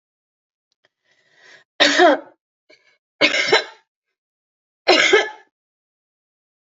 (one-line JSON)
{"three_cough_length": "6.7 s", "three_cough_amplitude": 28504, "three_cough_signal_mean_std_ratio": 0.32, "survey_phase": "beta (2021-08-13 to 2022-03-07)", "age": "65+", "gender": "Female", "wearing_mask": "No", "symptom_runny_or_blocked_nose": true, "smoker_status": "Ex-smoker", "respiratory_condition_asthma": false, "respiratory_condition_other": false, "recruitment_source": "Test and Trace", "submission_delay": "2 days", "covid_test_result": "Positive", "covid_test_method": "ePCR"}